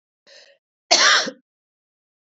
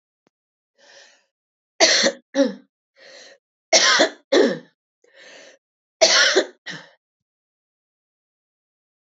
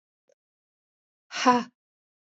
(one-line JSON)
{"cough_length": "2.2 s", "cough_amplitude": 29104, "cough_signal_mean_std_ratio": 0.33, "three_cough_length": "9.1 s", "three_cough_amplitude": 29443, "three_cough_signal_mean_std_ratio": 0.33, "exhalation_length": "2.4 s", "exhalation_amplitude": 17637, "exhalation_signal_mean_std_ratio": 0.23, "survey_phase": "beta (2021-08-13 to 2022-03-07)", "age": "45-64", "gender": "Female", "wearing_mask": "No", "symptom_cough_any": true, "symptom_runny_or_blocked_nose": true, "symptom_fatigue": true, "symptom_other": true, "smoker_status": "Never smoked", "respiratory_condition_asthma": true, "respiratory_condition_other": false, "recruitment_source": "Test and Trace", "submission_delay": "2 days", "covid_test_result": "Positive", "covid_test_method": "LAMP"}